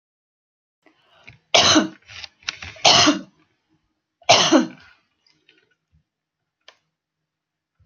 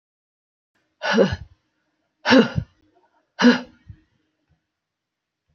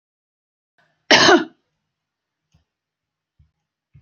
{"three_cough_length": "7.9 s", "three_cough_amplitude": 30162, "three_cough_signal_mean_std_ratio": 0.3, "exhalation_length": "5.5 s", "exhalation_amplitude": 27083, "exhalation_signal_mean_std_ratio": 0.28, "cough_length": "4.0 s", "cough_amplitude": 29591, "cough_signal_mean_std_ratio": 0.22, "survey_phase": "beta (2021-08-13 to 2022-03-07)", "age": "45-64", "gender": "Female", "wearing_mask": "No", "symptom_none": true, "smoker_status": "Never smoked", "respiratory_condition_asthma": false, "respiratory_condition_other": false, "recruitment_source": "REACT", "submission_delay": "2 days", "covid_test_result": "Negative", "covid_test_method": "RT-qPCR", "influenza_a_test_result": "Negative", "influenza_b_test_result": "Negative"}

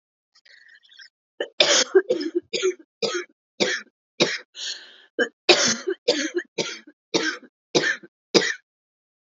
{"cough_length": "9.3 s", "cough_amplitude": 31059, "cough_signal_mean_std_ratio": 0.42, "survey_phase": "alpha (2021-03-01 to 2021-08-12)", "age": "18-44", "gender": "Female", "wearing_mask": "No", "symptom_cough_any": true, "symptom_shortness_of_breath": true, "symptom_fatigue": true, "symptom_change_to_sense_of_smell_or_taste": true, "symptom_loss_of_taste": true, "symptom_onset": "6 days", "smoker_status": "Never smoked", "respiratory_condition_asthma": false, "respiratory_condition_other": false, "recruitment_source": "Test and Trace", "submission_delay": "2 days", "covid_test_result": "Positive", "covid_test_method": "RT-qPCR", "covid_ct_value": 19.4, "covid_ct_gene": "N gene", "covid_ct_mean": 20.0, "covid_viral_load": "270000 copies/ml", "covid_viral_load_category": "Low viral load (10K-1M copies/ml)"}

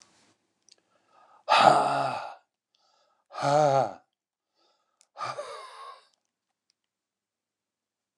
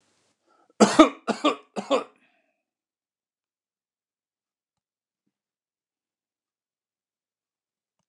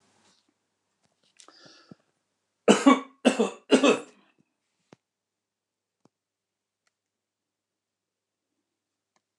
{"exhalation_length": "8.2 s", "exhalation_amplitude": 23530, "exhalation_signal_mean_std_ratio": 0.32, "cough_length": "8.1 s", "cough_amplitude": 29203, "cough_signal_mean_std_ratio": 0.17, "three_cough_length": "9.4 s", "three_cough_amplitude": 21226, "three_cough_signal_mean_std_ratio": 0.2, "survey_phase": "beta (2021-08-13 to 2022-03-07)", "age": "65+", "gender": "Male", "wearing_mask": "No", "symptom_none": true, "smoker_status": "Current smoker (1 to 10 cigarettes per day)", "respiratory_condition_asthma": false, "respiratory_condition_other": false, "recruitment_source": "REACT", "submission_delay": "1 day", "covid_test_result": "Negative", "covid_test_method": "RT-qPCR", "influenza_a_test_result": "Negative", "influenza_b_test_result": "Negative"}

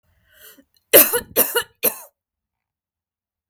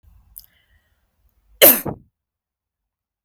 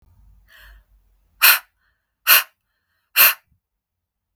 {"three_cough_length": "3.5 s", "three_cough_amplitude": 32768, "three_cough_signal_mean_std_ratio": 0.27, "cough_length": "3.2 s", "cough_amplitude": 32767, "cough_signal_mean_std_ratio": 0.19, "exhalation_length": "4.4 s", "exhalation_amplitude": 32768, "exhalation_signal_mean_std_ratio": 0.26, "survey_phase": "beta (2021-08-13 to 2022-03-07)", "age": "18-44", "gender": "Female", "wearing_mask": "No", "symptom_none": true, "smoker_status": "Never smoked", "respiratory_condition_asthma": false, "respiratory_condition_other": false, "recruitment_source": "REACT", "submission_delay": "1 day", "covid_test_result": "Negative", "covid_test_method": "RT-qPCR"}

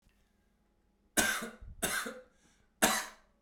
{"three_cough_length": "3.4 s", "three_cough_amplitude": 9929, "three_cough_signal_mean_std_ratio": 0.4, "survey_phase": "beta (2021-08-13 to 2022-03-07)", "age": "18-44", "gender": "Male", "wearing_mask": "No", "symptom_cough_any": true, "smoker_status": "Never smoked", "respiratory_condition_asthma": false, "respiratory_condition_other": false, "recruitment_source": "REACT", "submission_delay": "1 day", "covid_test_result": "Negative", "covid_test_method": "RT-qPCR", "influenza_a_test_result": "Negative", "influenza_b_test_result": "Negative"}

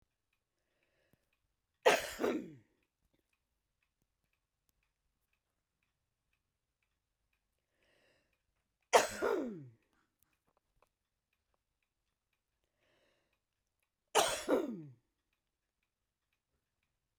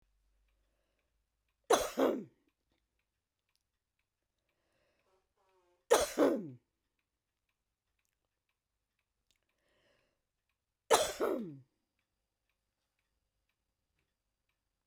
{"cough_length": "17.2 s", "cough_amplitude": 9622, "cough_signal_mean_std_ratio": 0.21, "three_cough_length": "14.9 s", "three_cough_amplitude": 10462, "three_cough_signal_mean_std_ratio": 0.22, "survey_phase": "beta (2021-08-13 to 2022-03-07)", "age": "45-64", "gender": "Female", "wearing_mask": "No", "symptom_none": true, "smoker_status": "Ex-smoker", "respiratory_condition_asthma": false, "respiratory_condition_other": false, "recruitment_source": "REACT", "submission_delay": "1 day", "covid_test_result": "Negative", "covid_test_method": "RT-qPCR", "influenza_a_test_result": "Negative", "influenza_b_test_result": "Negative"}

